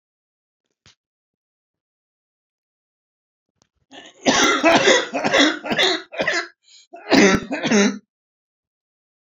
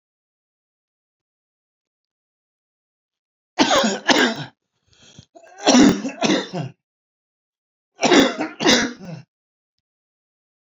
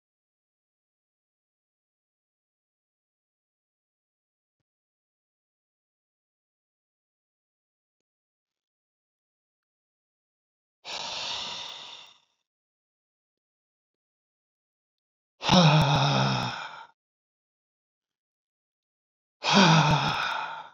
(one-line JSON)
{"cough_length": "9.4 s", "cough_amplitude": 27893, "cough_signal_mean_std_ratio": 0.41, "three_cough_length": "10.7 s", "three_cough_amplitude": 32767, "three_cough_signal_mean_std_ratio": 0.35, "exhalation_length": "20.7 s", "exhalation_amplitude": 21775, "exhalation_signal_mean_std_ratio": 0.27, "survey_phase": "beta (2021-08-13 to 2022-03-07)", "age": "65+", "gender": "Male", "wearing_mask": "No", "symptom_cough_any": true, "symptom_shortness_of_breath": true, "symptom_onset": "12 days", "smoker_status": "Ex-smoker", "respiratory_condition_asthma": false, "respiratory_condition_other": true, "recruitment_source": "REACT", "submission_delay": "7 days", "covid_test_result": "Negative", "covid_test_method": "RT-qPCR", "influenza_a_test_result": "Negative", "influenza_b_test_result": "Negative"}